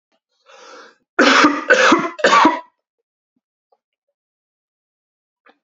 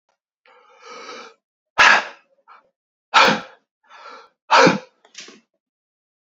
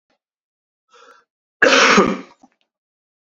{"three_cough_length": "5.6 s", "three_cough_amplitude": 32767, "three_cough_signal_mean_std_ratio": 0.37, "exhalation_length": "6.4 s", "exhalation_amplitude": 29946, "exhalation_signal_mean_std_ratio": 0.29, "cough_length": "3.3 s", "cough_amplitude": 32767, "cough_signal_mean_std_ratio": 0.32, "survey_phase": "alpha (2021-03-01 to 2021-08-12)", "age": "18-44", "gender": "Male", "wearing_mask": "No", "symptom_cough_any": true, "symptom_abdominal_pain": true, "symptom_fatigue": true, "smoker_status": "Never smoked", "respiratory_condition_asthma": false, "respiratory_condition_other": false, "recruitment_source": "Test and Trace", "submission_delay": "2 days", "covid_test_result": "Positive", "covid_test_method": "RT-qPCR", "covid_ct_value": 19.1, "covid_ct_gene": "ORF1ab gene", "covid_ct_mean": 20.1, "covid_viral_load": "250000 copies/ml", "covid_viral_load_category": "Low viral load (10K-1M copies/ml)"}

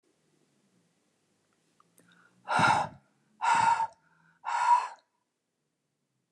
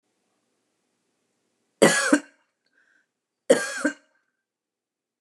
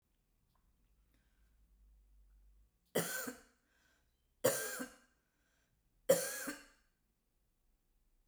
{"exhalation_length": "6.3 s", "exhalation_amplitude": 8250, "exhalation_signal_mean_std_ratio": 0.37, "cough_length": "5.2 s", "cough_amplitude": 29203, "cough_signal_mean_std_ratio": 0.25, "three_cough_length": "8.3 s", "three_cough_amplitude": 5205, "three_cough_signal_mean_std_ratio": 0.27, "survey_phase": "beta (2021-08-13 to 2022-03-07)", "age": "65+", "gender": "Female", "wearing_mask": "No", "symptom_none": true, "smoker_status": "Ex-smoker", "respiratory_condition_asthma": false, "respiratory_condition_other": false, "recruitment_source": "REACT", "submission_delay": "1 day", "covid_test_result": "Negative", "covid_test_method": "RT-qPCR"}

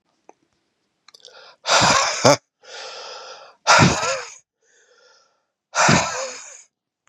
{"exhalation_length": "7.1 s", "exhalation_amplitude": 32767, "exhalation_signal_mean_std_ratio": 0.4, "survey_phase": "beta (2021-08-13 to 2022-03-07)", "age": "18-44", "gender": "Male", "wearing_mask": "No", "symptom_cough_any": true, "symptom_runny_or_blocked_nose": true, "symptom_sore_throat": true, "symptom_onset": "4 days", "smoker_status": "Never smoked", "respiratory_condition_asthma": false, "respiratory_condition_other": false, "recruitment_source": "Test and Trace", "submission_delay": "2 days", "covid_test_result": "Positive", "covid_test_method": "RT-qPCR", "covid_ct_value": 18.3, "covid_ct_gene": "ORF1ab gene", "covid_ct_mean": 18.8, "covid_viral_load": "710000 copies/ml", "covid_viral_load_category": "Low viral load (10K-1M copies/ml)"}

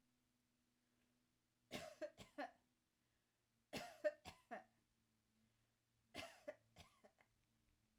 {"three_cough_length": "8.0 s", "three_cough_amplitude": 1042, "three_cough_signal_mean_std_ratio": 0.28, "survey_phase": "alpha (2021-03-01 to 2021-08-12)", "age": "45-64", "gender": "Female", "wearing_mask": "No", "symptom_none": true, "symptom_fatigue": true, "smoker_status": "Ex-smoker", "respiratory_condition_asthma": true, "respiratory_condition_other": false, "recruitment_source": "REACT", "submission_delay": "1 day", "covid_test_result": "Negative", "covid_test_method": "RT-qPCR"}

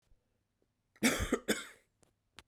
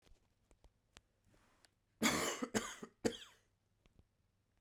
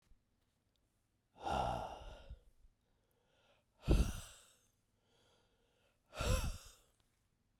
{"cough_length": "2.5 s", "cough_amplitude": 5810, "cough_signal_mean_std_ratio": 0.33, "three_cough_length": "4.6 s", "three_cough_amplitude": 3359, "three_cough_signal_mean_std_ratio": 0.31, "exhalation_length": "7.6 s", "exhalation_amplitude": 3350, "exhalation_signal_mean_std_ratio": 0.32, "survey_phase": "beta (2021-08-13 to 2022-03-07)", "age": "18-44", "gender": "Male", "wearing_mask": "No", "symptom_cough_any": true, "symptom_runny_or_blocked_nose": true, "symptom_shortness_of_breath": true, "symptom_fatigue": true, "symptom_change_to_sense_of_smell_or_taste": true, "symptom_other": true, "symptom_onset": "2 days", "smoker_status": "Never smoked", "respiratory_condition_asthma": false, "respiratory_condition_other": false, "recruitment_source": "Test and Trace", "submission_delay": "2 days", "covid_test_result": "Positive", "covid_test_method": "RT-qPCR"}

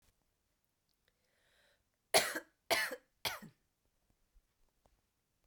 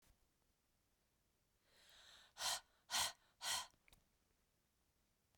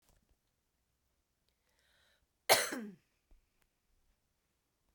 {"three_cough_length": "5.5 s", "three_cough_amplitude": 6695, "three_cough_signal_mean_std_ratio": 0.23, "exhalation_length": "5.4 s", "exhalation_amplitude": 1306, "exhalation_signal_mean_std_ratio": 0.3, "cough_length": "4.9 s", "cough_amplitude": 9489, "cough_signal_mean_std_ratio": 0.17, "survey_phase": "beta (2021-08-13 to 2022-03-07)", "age": "18-44", "gender": "Female", "wearing_mask": "No", "symptom_runny_or_blocked_nose": true, "symptom_fatigue": true, "symptom_change_to_sense_of_smell_or_taste": true, "symptom_loss_of_taste": true, "symptom_other": true, "symptom_onset": "7 days", "smoker_status": "Never smoked", "respiratory_condition_asthma": false, "respiratory_condition_other": false, "recruitment_source": "Test and Trace", "submission_delay": "2 days", "covid_test_result": "Positive", "covid_test_method": "RT-qPCR"}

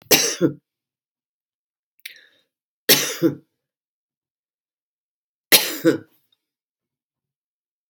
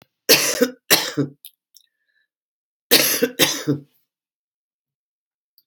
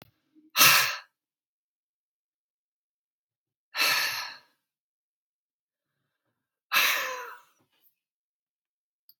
{"three_cough_length": "7.9 s", "three_cough_amplitude": 32768, "three_cough_signal_mean_std_ratio": 0.25, "cough_length": "5.7 s", "cough_amplitude": 32768, "cough_signal_mean_std_ratio": 0.35, "exhalation_length": "9.2 s", "exhalation_amplitude": 20438, "exhalation_signal_mean_std_ratio": 0.28, "survey_phase": "alpha (2021-03-01 to 2021-08-12)", "age": "45-64", "gender": "Female", "wearing_mask": "No", "symptom_none": true, "smoker_status": "Current smoker (11 or more cigarettes per day)", "respiratory_condition_asthma": false, "respiratory_condition_other": false, "recruitment_source": "REACT", "submission_delay": "1 day", "covid_test_result": "Negative", "covid_test_method": "RT-qPCR"}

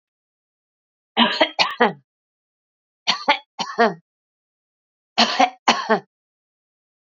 {"three_cough_length": "7.2 s", "three_cough_amplitude": 31795, "three_cough_signal_mean_std_ratio": 0.33, "survey_phase": "beta (2021-08-13 to 2022-03-07)", "age": "45-64", "gender": "Female", "wearing_mask": "No", "symptom_none": true, "smoker_status": "Never smoked", "respiratory_condition_asthma": false, "respiratory_condition_other": false, "recruitment_source": "REACT", "submission_delay": "1 day", "covid_test_result": "Negative", "covid_test_method": "RT-qPCR"}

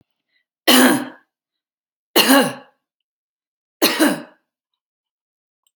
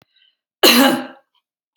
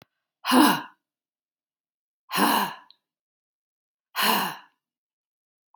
{"three_cough_length": "5.8 s", "three_cough_amplitude": 32767, "three_cough_signal_mean_std_ratio": 0.33, "cough_length": "1.8 s", "cough_amplitude": 32768, "cough_signal_mean_std_ratio": 0.38, "exhalation_length": "5.8 s", "exhalation_amplitude": 18903, "exhalation_signal_mean_std_ratio": 0.33, "survey_phase": "beta (2021-08-13 to 2022-03-07)", "age": "45-64", "gender": "Female", "wearing_mask": "No", "symptom_none": true, "smoker_status": "Never smoked", "respiratory_condition_asthma": false, "respiratory_condition_other": false, "recruitment_source": "Test and Trace", "submission_delay": "0 days", "covid_test_result": "Negative", "covid_test_method": "LFT"}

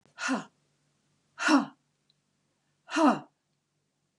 {"exhalation_length": "4.2 s", "exhalation_amplitude": 10778, "exhalation_signal_mean_std_ratio": 0.32, "survey_phase": "beta (2021-08-13 to 2022-03-07)", "age": "65+", "gender": "Female", "wearing_mask": "No", "symptom_cough_any": true, "symptom_runny_or_blocked_nose": true, "symptom_sore_throat": true, "symptom_fatigue": true, "symptom_fever_high_temperature": true, "smoker_status": "Ex-smoker", "respiratory_condition_asthma": false, "respiratory_condition_other": false, "recruitment_source": "REACT", "submission_delay": "3 days", "covid_test_result": "Negative", "covid_test_method": "RT-qPCR"}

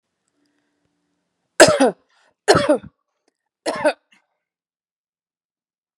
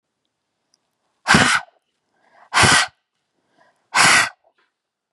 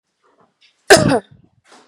{"three_cough_length": "6.0 s", "three_cough_amplitude": 32768, "three_cough_signal_mean_std_ratio": 0.26, "exhalation_length": "5.1 s", "exhalation_amplitude": 31853, "exhalation_signal_mean_std_ratio": 0.36, "cough_length": "1.9 s", "cough_amplitude": 32768, "cough_signal_mean_std_ratio": 0.29, "survey_phase": "beta (2021-08-13 to 2022-03-07)", "age": "45-64", "gender": "Female", "wearing_mask": "No", "symptom_none": true, "smoker_status": "Ex-smoker", "respiratory_condition_asthma": false, "respiratory_condition_other": false, "recruitment_source": "REACT", "submission_delay": "1 day", "covid_test_result": "Negative", "covid_test_method": "RT-qPCR", "influenza_a_test_result": "Negative", "influenza_b_test_result": "Negative"}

